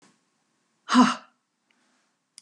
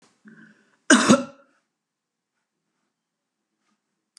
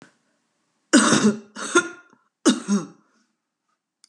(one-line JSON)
{"exhalation_length": "2.4 s", "exhalation_amplitude": 19824, "exhalation_signal_mean_std_ratio": 0.25, "cough_length": "4.2 s", "cough_amplitude": 29457, "cough_signal_mean_std_ratio": 0.21, "three_cough_length": "4.1 s", "three_cough_amplitude": 25193, "three_cough_signal_mean_std_ratio": 0.37, "survey_phase": "beta (2021-08-13 to 2022-03-07)", "age": "65+", "gender": "Female", "wearing_mask": "No", "symptom_none": true, "smoker_status": "Ex-smoker", "respiratory_condition_asthma": false, "respiratory_condition_other": false, "recruitment_source": "REACT", "submission_delay": "2 days", "covid_test_result": "Negative", "covid_test_method": "RT-qPCR", "influenza_a_test_result": "Negative", "influenza_b_test_result": "Negative"}